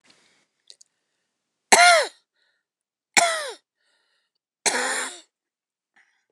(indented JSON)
{
  "three_cough_length": "6.3 s",
  "three_cough_amplitude": 29203,
  "three_cough_signal_mean_std_ratio": 0.28,
  "survey_phase": "beta (2021-08-13 to 2022-03-07)",
  "age": "45-64",
  "gender": "Female",
  "wearing_mask": "No",
  "symptom_none": true,
  "smoker_status": "Ex-smoker",
  "respiratory_condition_asthma": false,
  "respiratory_condition_other": false,
  "recruitment_source": "Test and Trace",
  "submission_delay": "2 days",
  "covid_test_result": "Negative",
  "covid_test_method": "RT-qPCR"
}